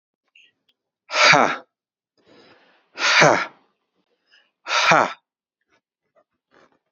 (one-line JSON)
{"exhalation_length": "6.9 s", "exhalation_amplitude": 29626, "exhalation_signal_mean_std_ratio": 0.32, "survey_phase": "beta (2021-08-13 to 2022-03-07)", "age": "45-64", "gender": "Male", "wearing_mask": "No", "symptom_cough_any": true, "symptom_runny_or_blocked_nose": true, "symptom_onset": "13 days", "smoker_status": "Never smoked", "respiratory_condition_asthma": false, "respiratory_condition_other": false, "recruitment_source": "REACT", "submission_delay": "3 days", "covid_test_result": "Negative", "covid_test_method": "RT-qPCR", "influenza_a_test_result": "Negative", "influenza_b_test_result": "Negative"}